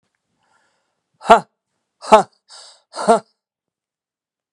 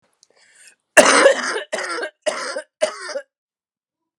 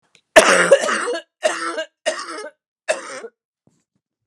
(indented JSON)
{
  "exhalation_length": "4.5 s",
  "exhalation_amplitude": 32768,
  "exhalation_signal_mean_std_ratio": 0.22,
  "cough_length": "4.2 s",
  "cough_amplitude": 32768,
  "cough_signal_mean_std_ratio": 0.38,
  "three_cough_length": "4.3 s",
  "three_cough_amplitude": 32768,
  "three_cough_signal_mean_std_ratio": 0.4,
  "survey_phase": "beta (2021-08-13 to 2022-03-07)",
  "age": "45-64",
  "gender": "Female",
  "wearing_mask": "No",
  "symptom_cough_any": true,
  "symptom_runny_or_blocked_nose": true,
  "symptom_sore_throat": true,
  "symptom_fatigue": true,
  "symptom_fever_high_temperature": true,
  "symptom_headache": true,
  "symptom_change_to_sense_of_smell_or_taste": true,
  "symptom_other": true,
  "symptom_onset": "3 days",
  "smoker_status": "Never smoked",
  "respiratory_condition_asthma": false,
  "respiratory_condition_other": false,
  "recruitment_source": "Test and Trace",
  "submission_delay": "2 days",
  "covid_test_result": "Positive",
  "covid_test_method": "RT-qPCR",
  "covid_ct_value": 23.7,
  "covid_ct_gene": "N gene"
}